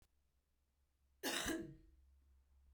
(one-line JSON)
{"cough_length": "2.7 s", "cough_amplitude": 1911, "cough_signal_mean_std_ratio": 0.39, "survey_phase": "beta (2021-08-13 to 2022-03-07)", "age": "45-64", "gender": "Female", "wearing_mask": "No", "symptom_runny_or_blocked_nose": true, "symptom_change_to_sense_of_smell_or_taste": true, "symptom_loss_of_taste": true, "symptom_onset": "4 days", "smoker_status": "Never smoked", "respiratory_condition_asthma": false, "respiratory_condition_other": false, "recruitment_source": "Test and Trace", "submission_delay": "2 days", "covid_test_result": "Positive", "covid_test_method": "ePCR"}